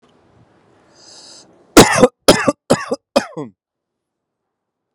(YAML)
cough_length: 4.9 s
cough_amplitude: 32768
cough_signal_mean_std_ratio: 0.28
survey_phase: alpha (2021-03-01 to 2021-08-12)
age: 18-44
gender: Male
wearing_mask: 'Yes'
symptom_none: true
smoker_status: Ex-smoker
respiratory_condition_asthma: false
respiratory_condition_other: false
recruitment_source: REACT
submission_delay: 1 day
covid_test_result: Negative
covid_test_method: RT-qPCR